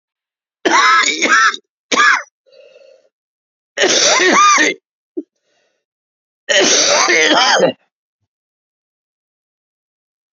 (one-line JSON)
{"three_cough_length": "10.3 s", "three_cough_amplitude": 32767, "three_cough_signal_mean_std_ratio": 0.5, "survey_phase": "beta (2021-08-13 to 2022-03-07)", "age": "45-64", "gender": "Male", "wearing_mask": "No", "symptom_cough_any": true, "symptom_new_continuous_cough": true, "symptom_runny_or_blocked_nose": true, "symptom_fatigue": true, "symptom_fever_high_temperature": true, "symptom_headache": true, "symptom_onset": "3 days", "smoker_status": "Never smoked", "respiratory_condition_asthma": false, "respiratory_condition_other": false, "recruitment_source": "Test and Trace", "submission_delay": "2 days", "covid_test_result": "Positive", "covid_test_method": "RT-qPCR", "covid_ct_value": 12.8, "covid_ct_gene": "ORF1ab gene", "covid_ct_mean": 13.2, "covid_viral_load": "47000000 copies/ml", "covid_viral_load_category": "High viral load (>1M copies/ml)"}